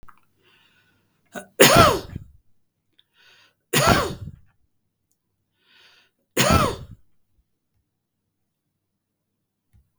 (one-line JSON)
{"three_cough_length": "10.0 s", "three_cough_amplitude": 32768, "three_cough_signal_mean_std_ratio": 0.27, "survey_phase": "beta (2021-08-13 to 2022-03-07)", "age": "65+", "gender": "Male", "wearing_mask": "No", "symptom_none": true, "smoker_status": "Ex-smoker", "respiratory_condition_asthma": false, "respiratory_condition_other": false, "recruitment_source": "REACT", "submission_delay": "6 days", "covid_test_result": "Negative", "covid_test_method": "RT-qPCR", "influenza_a_test_result": "Negative", "influenza_b_test_result": "Negative"}